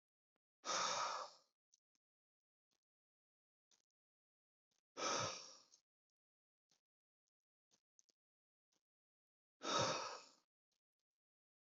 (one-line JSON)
{"exhalation_length": "11.7 s", "exhalation_amplitude": 1517, "exhalation_signal_mean_std_ratio": 0.29, "survey_phase": "beta (2021-08-13 to 2022-03-07)", "age": "18-44", "gender": "Male", "wearing_mask": "No", "symptom_none": true, "smoker_status": "Never smoked", "respiratory_condition_asthma": false, "respiratory_condition_other": false, "recruitment_source": "REACT", "submission_delay": "2 days", "covid_test_result": "Negative", "covid_test_method": "RT-qPCR", "influenza_a_test_result": "Negative", "influenza_b_test_result": "Negative"}